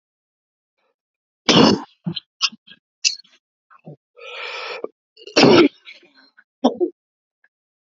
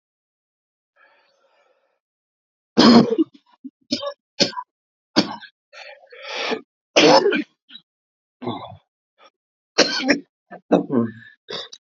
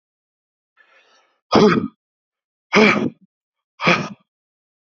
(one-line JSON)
{"cough_length": "7.9 s", "cough_amplitude": 32768, "cough_signal_mean_std_ratio": 0.3, "three_cough_length": "11.9 s", "three_cough_amplitude": 31384, "three_cough_signal_mean_std_ratio": 0.33, "exhalation_length": "4.9 s", "exhalation_amplitude": 29002, "exhalation_signal_mean_std_ratio": 0.33, "survey_phase": "alpha (2021-03-01 to 2021-08-12)", "age": "45-64", "gender": "Male", "wearing_mask": "No", "symptom_cough_any": true, "symptom_shortness_of_breath": true, "symptom_headache": true, "symptom_change_to_sense_of_smell_or_taste": true, "symptom_onset": "3 days", "smoker_status": "Never smoked", "respiratory_condition_asthma": false, "respiratory_condition_other": false, "recruitment_source": "Test and Trace", "submission_delay": "2 days", "covid_test_result": "Positive", "covid_test_method": "RT-qPCR", "covid_ct_value": 15.9, "covid_ct_gene": "ORF1ab gene", "covid_ct_mean": 16.5, "covid_viral_load": "3900000 copies/ml", "covid_viral_load_category": "High viral load (>1M copies/ml)"}